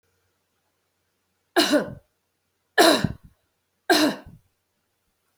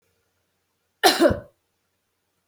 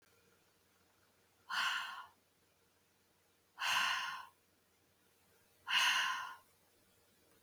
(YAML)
three_cough_length: 5.4 s
three_cough_amplitude: 24313
three_cough_signal_mean_std_ratio: 0.3
cough_length: 2.5 s
cough_amplitude: 27711
cough_signal_mean_std_ratio: 0.27
exhalation_length: 7.4 s
exhalation_amplitude: 2962
exhalation_signal_mean_std_ratio: 0.4
survey_phase: beta (2021-08-13 to 2022-03-07)
age: 45-64
gender: Female
wearing_mask: 'No'
symptom_new_continuous_cough: true
symptom_runny_or_blocked_nose: true
symptom_fatigue: true
symptom_headache: true
symptom_change_to_sense_of_smell_or_taste: true
symptom_loss_of_taste: true
symptom_other: true
symptom_onset: 3 days
smoker_status: Never smoked
respiratory_condition_asthma: false
respiratory_condition_other: false
recruitment_source: Test and Trace
submission_delay: 1 day
covid_test_result: Positive
covid_test_method: RT-qPCR
covid_ct_value: 14.3
covid_ct_gene: N gene
covid_ct_mean: 14.9
covid_viral_load: 13000000 copies/ml
covid_viral_load_category: High viral load (>1M copies/ml)